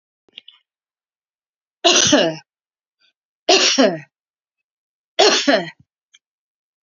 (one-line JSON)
{"three_cough_length": "6.8 s", "three_cough_amplitude": 32767, "three_cough_signal_mean_std_ratio": 0.36, "survey_phase": "beta (2021-08-13 to 2022-03-07)", "age": "65+", "gender": "Female", "wearing_mask": "No", "symptom_none": true, "smoker_status": "Ex-smoker", "respiratory_condition_asthma": true, "respiratory_condition_other": false, "recruitment_source": "REACT", "submission_delay": "2 days", "covid_test_result": "Negative", "covid_test_method": "RT-qPCR", "influenza_a_test_result": "Negative", "influenza_b_test_result": "Negative"}